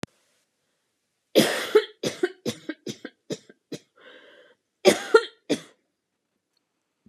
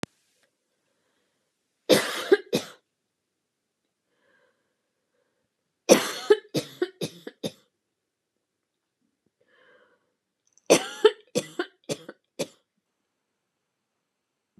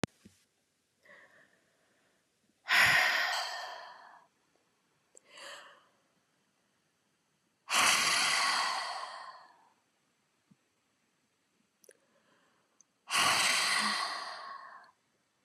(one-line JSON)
{"cough_length": "7.1 s", "cough_amplitude": 26215, "cough_signal_mean_std_ratio": 0.27, "three_cough_length": "14.6 s", "three_cough_amplitude": 29416, "three_cough_signal_mean_std_ratio": 0.21, "exhalation_length": "15.4 s", "exhalation_amplitude": 8595, "exhalation_signal_mean_std_ratio": 0.4, "survey_phase": "beta (2021-08-13 to 2022-03-07)", "age": "18-44", "gender": "Female", "wearing_mask": "No", "symptom_none": true, "smoker_status": "Never smoked", "respiratory_condition_asthma": false, "respiratory_condition_other": false, "recruitment_source": "REACT", "submission_delay": "0 days", "covid_test_result": "Negative", "covid_test_method": "RT-qPCR"}